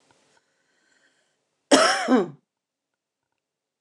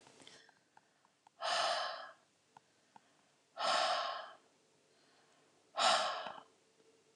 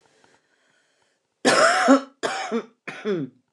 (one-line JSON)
{"cough_length": "3.8 s", "cough_amplitude": 26137, "cough_signal_mean_std_ratio": 0.29, "exhalation_length": "7.2 s", "exhalation_amplitude": 3607, "exhalation_signal_mean_std_ratio": 0.42, "three_cough_length": "3.5 s", "three_cough_amplitude": 23753, "three_cough_signal_mean_std_ratio": 0.44, "survey_phase": "beta (2021-08-13 to 2022-03-07)", "age": "45-64", "gender": "Female", "wearing_mask": "No", "symptom_none": true, "smoker_status": "Current smoker (11 or more cigarettes per day)", "respiratory_condition_asthma": false, "respiratory_condition_other": false, "recruitment_source": "REACT", "submission_delay": "1 day", "covid_test_result": "Negative", "covid_test_method": "RT-qPCR", "influenza_a_test_result": "Unknown/Void", "influenza_b_test_result": "Unknown/Void"}